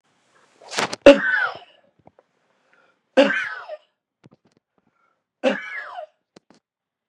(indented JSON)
{
  "three_cough_length": "7.1 s",
  "three_cough_amplitude": 32768,
  "three_cough_signal_mean_std_ratio": 0.26,
  "survey_phase": "beta (2021-08-13 to 2022-03-07)",
  "age": "65+",
  "gender": "Male",
  "wearing_mask": "No",
  "symptom_none": true,
  "smoker_status": "Ex-smoker",
  "respiratory_condition_asthma": false,
  "respiratory_condition_other": true,
  "recruitment_source": "REACT",
  "submission_delay": "1 day",
  "covid_test_result": "Negative",
  "covid_test_method": "RT-qPCR",
  "influenza_a_test_result": "Negative",
  "influenza_b_test_result": "Negative"
}